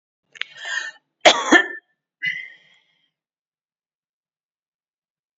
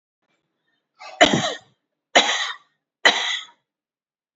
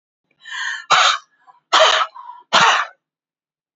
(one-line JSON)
{"cough_length": "5.4 s", "cough_amplitude": 28966, "cough_signal_mean_std_ratio": 0.24, "three_cough_length": "4.4 s", "three_cough_amplitude": 30792, "three_cough_signal_mean_std_ratio": 0.33, "exhalation_length": "3.8 s", "exhalation_amplitude": 31120, "exhalation_signal_mean_std_ratio": 0.45, "survey_phase": "alpha (2021-03-01 to 2021-08-12)", "age": "65+", "gender": "Female", "wearing_mask": "No", "symptom_none": true, "smoker_status": "Ex-smoker", "respiratory_condition_asthma": false, "respiratory_condition_other": false, "recruitment_source": "REACT", "submission_delay": "1 day", "covid_test_result": "Negative", "covid_test_method": "RT-qPCR"}